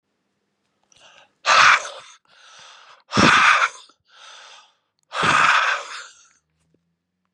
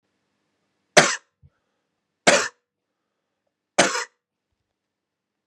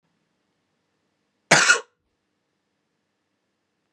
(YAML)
exhalation_length: 7.3 s
exhalation_amplitude: 30029
exhalation_signal_mean_std_ratio: 0.39
three_cough_length: 5.5 s
three_cough_amplitude: 32768
three_cough_signal_mean_std_ratio: 0.22
cough_length: 3.9 s
cough_amplitude: 31270
cough_signal_mean_std_ratio: 0.2
survey_phase: beta (2021-08-13 to 2022-03-07)
age: 18-44
gender: Male
wearing_mask: 'No'
symptom_cough_any: true
symptom_runny_or_blocked_nose: true
symptom_shortness_of_breath: true
symptom_fatigue: true
symptom_fever_high_temperature: true
symptom_headache: true
symptom_other: true
symptom_onset: 2 days
smoker_status: Ex-smoker
respiratory_condition_asthma: false
respiratory_condition_other: false
recruitment_source: Test and Trace
submission_delay: 2 days
covid_test_result: Positive
covid_test_method: RT-qPCR
covid_ct_value: 19.5
covid_ct_gene: N gene
covid_ct_mean: 20.3
covid_viral_load: 220000 copies/ml
covid_viral_load_category: Low viral load (10K-1M copies/ml)